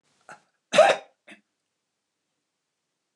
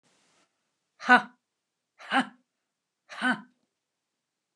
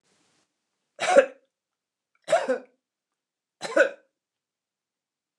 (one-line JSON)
{"cough_length": "3.2 s", "cough_amplitude": 18211, "cough_signal_mean_std_ratio": 0.21, "exhalation_length": "4.6 s", "exhalation_amplitude": 21353, "exhalation_signal_mean_std_ratio": 0.22, "three_cough_length": "5.4 s", "three_cough_amplitude": 20589, "three_cough_signal_mean_std_ratio": 0.26, "survey_phase": "beta (2021-08-13 to 2022-03-07)", "age": "65+", "gender": "Female", "wearing_mask": "No", "symptom_none": true, "smoker_status": "Never smoked", "respiratory_condition_asthma": false, "respiratory_condition_other": false, "recruitment_source": "REACT", "submission_delay": "1 day", "covid_test_result": "Negative", "covid_test_method": "RT-qPCR", "influenza_a_test_result": "Negative", "influenza_b_test_result": "Negative"}